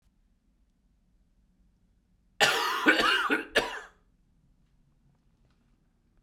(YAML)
cough_length: 6.2 s
cough_amplitude: 15088
cough_signal_mean_std_ratio: 0.34
survey_phase: alpha (2021-03-01 to 2021-08-12)
age: 18-44
gender: Male
wearing_mask: 'No'
symptom_cough_any: true
symptom_new_continuous_cough: true
symptom_fatigue: true
symptom_fever_high_temperature: true
symptom_headache: true
symptom_onset: 5 days
smoker_status: Never smoked
respiratory_condition_asthma: false
respiratory_condition_other: false
recruitment_source: Test and Trace
submission_delay: 2 days
covid_test_result: Positive
covid_test_method: RT-qPCR
covid_ct_value: 30.5
covid_ct_gene: N gene